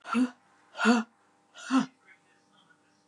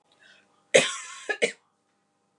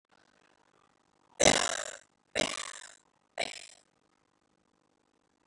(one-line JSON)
{"exhalation_length": "3.1 s", "exhalation_amplitude": 8345, "exhalation_signal_mean_std_ratio": 0.38, "cough_length": "2.4 s", "cough_amplitude": 24674, "cough_signal_mean_std_ratio": 0.27, "three_cough_length": "5.5 s", "three_cough_amplitude": 13588, "three_cough_signal_mean_std_ratio": 0.22, "survey_phase": "beta (2021-08-13 to 2022-03-07)", "age": "45-64", "gender": "Female", "wearing_mask": "No", "symptom_none": true, "smoker_status": "Never smoked", "respiratory_condition_asthma": false, "respiratory_condition_other": false, "recruitment_source": "REACT", "submission_delay": "2 days", "covid_test_result": "Negative", "covid_test_method": "RT-qPCR", "influenza_a_test_result": "Negative", "influenza_b_test_result": "Negative"}